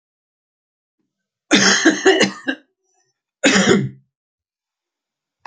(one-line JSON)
{"cough_length": "5.5 s", "cough_amplitude": 30270, "cough_signal_mean_std_ratio": 0.38, "survey_phase": "alpha (2021-03-01 to 2021-08-12)", "age": "65+", "gender": "Male", "wearing_mask": "No", "symptom_none": true, "smoker_status": "Never smoked", "respiratory_condition_asthma": false, "respiratory_condition_other": false, "recruitment_source": "REACT", "submission_delay": "2 days", "covid_test_result": "Negative", "covid_test_method": "RT-qPCR"}